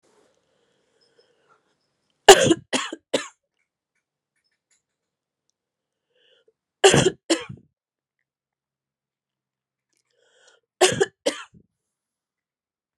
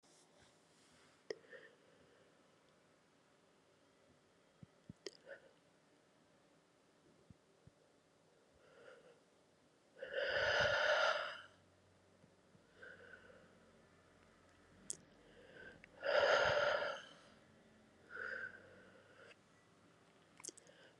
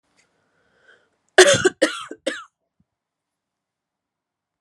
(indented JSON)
{
  "three_cough_length": "13.0 s",
  "three_cough_amplitude": 32768,
  "three_cough_signal_mean_std_ratio": 0.19,
  "exhalation_length": "21.0 s",
  "exhalation_amplitude": 2867,
  "exhalation_signal_mean_std_ratio": 0.33,
  "cough_length": "4.6 s",
  "cough_amplitude": 32768,
  "cough_signal_mean_std_ratio": 0.23,
  "survey_phase": "beta (2021-08-13 to 2022-03-07)",
  "age": "45-64",
  "gender": "Female",
  "wearing_mask": "No",
  "symptom_new_continuous_cough": true,
  "symptom_runny_or_blocked_nose": true,
  "symptom_sore_throat": true,
  "symptom_fatigue": true,
  "symptom_fever_high_temperature": true,
  "symptom_headache": true,
  "symptom_change_to_sense_of_smell_or_taste": true,
  "smoker_status": "Never smoked",
  "respiratory_condition_asthma": false,
  "respiratory_condition_other": false,
  "recruitment_source": "Test and Trace",
  "submission_delay": "2 days",
  "covid_test_result": "Positive",
  "covid_test_method": "RT-qPCR"
}